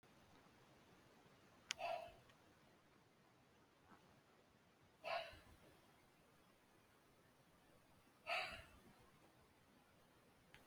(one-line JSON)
{"exhalation_length": "10.7 s", "exhalation_amplitude": 3090, "exhalation_signal_mean_std_ratio": 0.38, "survey_phase": "beta (2021-08-13 to 2022-03-07)", "age": "45-64", "gender": "Female", "wearing_mask": "No", "symptom_cough_any": true, "symptom_runny_or_blocked_nose": true, "symptom_shortness_of_breath": true, "symptom_sore_throat": true, "symptom_abdominal_pain": true, "symptom_fatigue": true, "symptom_fever_high_temperature": true, "symptom_headache": true, "symptom_other": true, "symptom_onset": "4 days", "smoker_status": "Never smoked", "respiratory_condition_asthma": false, "respiratory_condition_other": false, "recruitment_source": "Test and Trace", "submission_delay": "2 days", "covid_test_result": "Positive", "covid_test_method": "RT-qPCR", "covid_ct_value": 17.0, "covid_ct_gene": "ORF1ab gene"}